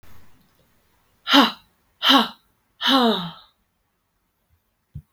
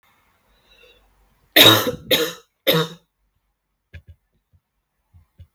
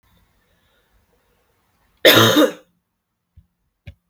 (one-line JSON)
{"exhalation_length": "5.1 s", "exhalation_amplitude": 32768, "exhalation_signal_mean_std_ratio": 0.34, "three_cough_length": "5.5 s", "three_cough_amplitude": 32768, "three_cough_signal_mean_std_ratio": 0.27, "cough_length": "4.1 s", "cough_amplitude": 32768, "cough_signal_mean_std_ratio": 0.27, "survey_phase": "beta (2021-08-13 to 2022-03-07)", "age": "18-44", "gender": "Female", "wearing_mask": "No", "symptom_cough_any": true, "symptom_shortness_of_breath": true, "symptom_fever_high_temperature": true, "smoker_status": "Never smoked", "respiratory_condition_asthma": true, "respiratory_condition_other": false, "recruitment_source": "Test and Trace", "submission_delay": "2 days", "covid_test_result": "Positive", "covid_test_method": "RT-qPCR", "covid_ct_value": 14.4, "covid_ct_gene": "ORF1ab gene", "covid_ct_mean": 14.7, "covid_viral_load": "15000000 copies/ml", "covid_viral_load_category": "High viral load (>1M copies/ml)"}